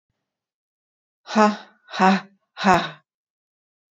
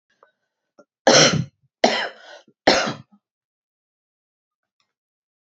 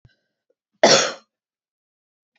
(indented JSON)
{
  "exhalation_length": "3.9 s",
  "exhalation_amplitude": 28299,
  "exhalation_signal_mean_std_ratio": 0.32,
  "three_cough_length": "5.5 s",
  "three_cough_amplitude": 30328,
  "three_cough_signal_mean_std_ratio": 0.29,
  "cough_length": "2.4 s",
  "cough_amplitude": 29177,
  "cough_signal_mean_std_ratio": 0.25,
  "survey_phase": "beta (2021-08-13 to 2022-03-07)",
  "age": "65+",
  "gender": "Female",
  "wearing_mask": "No",
  "symptom_none": true,
  "smoker_status": "Ex-smoker",
  "respiratory_condition_asthma": false,
  "respiratory_condition_other": false,
  "recruitment_source": "REACT",
  "submission_delay": "1 day",
  "covid_test_result": "Negative",
  "covid_test_method": "RT-qPCR",
  "influenza_a_test_result": "Negative",
  "influenza_b_test_result": "Negative"
}